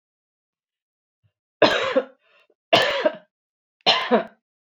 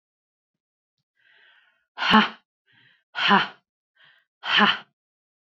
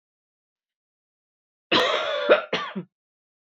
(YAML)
three_cough_length: 4.6 s
three_cough_amplitude: 28384
three_cough_signal_mean_std_ratio: 0.37
exhalation_length: 5.5 s
exhalation_amplitude: 26797
exhalation_signal_mean_std_ratio: 0.3
cough_length: 3.5 s
cough_amplitude: 18432
cough_signal_mean_std_ratio: 0.37
survey_phase: beta (2021-08-13 to 2022-03-07)
age: 45-64
gender: Female
wearing_mask: 'No'
symptom_none: true
smoker_status: Ex-smoker
respiratory_condition_asthma: false
respiratory_condition_other: false
recruitment_source: REACT
submission_delay: 1 day
covid_test_result: Negative
covid_test_method: RT-qPCR